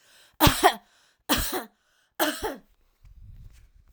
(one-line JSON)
{"three_cough_length": "3.9 s", "three_cough_amplitude": 23167, "three_cough_signal_mean_std_ratio": 0.35, "survey_phase": "alpha (2021-03-01 to 2021-08-12)", "age": "18-44", "gender": "Female", "wearing_mask": "No", "symptom_none": true, "smoker_status": "Never smoked", "respiratory_condition_asthma": false, "respiratory_condition_other": false, "recruitment_source": "REACT", "submission_delay": "3 days", "covid_test_result": "Negative", "covid_test_method": "RT-qPCR"}